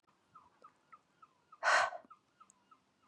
exhalation_length: 3.1 s
exhalation_amplitude: 4221
exhalation_signal_mean_std_ratio: 0.27
survey_phase: beta (2021-08-13 to 2022-03-07)
age: 18-44
gender: Female
wearing_mask: 'No'
symptom_sore_throat: true
symptom_fatigue: true
symptom_headache: true
symptom_onset: 3 days
smoker_status: Never smoked
respiratory_condition_asthma: false
respiratory_condition_other: false
recruitment_source: Test and Trace
submission_delay: 1 day
covid_test_result: Positive
covid_test_method: RT-qPCR
covid_ct_value: 17.2
covid_ct_gene: ORF1ab gene
covid_ct_mean: 17.3
covid_viral_load: 2200000 copies/ml
covid_viral_load_category: High viral load (>1M copies/ml)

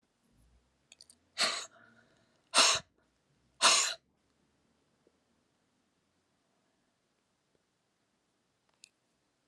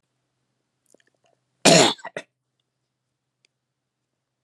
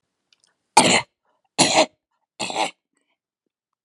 exhalation_length: 9.5 s
exhalation_amplitude: 11139
exhalation_signal_mean_std_ratio: 0.22
cough_length: 4.4 s
cough_amplitude: 31352
cough_signal_mean_std_ratio: 0.2
three_cough_length: 3.8 s
three_cough_amplitude: 32768
three_cough_signal_mean_std_ratio: 0.32
survey_phase: alpha (2021-03-01 to 2021-08-12)
age: 65+
gender: Female
wearing_mask: 'No'
symptom_none: true
smoker_status: Never smoked
respiratory_condition_asthma: true
respiratory_condition_other: false
recruitment_source: REACT
submission_delay: 1 day
covid_test_result: Negative
covid_test_method: RT-qPCR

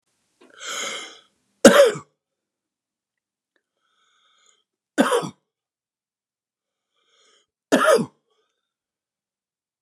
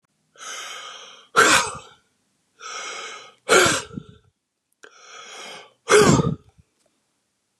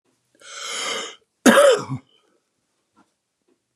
three_cough_length: 9.8 s
three_cough_amplitude: 32768
three_cough_signal_mean_std_ratio: 0.23
exhalation_length: 7.6 s
exhalation_amplitude: 29349
exhalation_signal_mean_std_ratio: 0.36
cough_length: 3.8 s
cough_amplitude: 31625
cough_signal_mean_std_ratio: 0.33
survey_phase: beta (2021-08-13 to 2022-03-07)
age: 65+
gender: Male
wearing_mask: 'No'
symptom_none: true
smoker_status: Ex-smoker
respiratory_condition_asthma: false
respiratory_condition_other: false
recruitment_source: REACT
submission_delay: 2 days
covid_test_result: Negative
covid_test_method: RT-qPCR
influenza_a_test_result: Negative
influenza_b_test_result: Negative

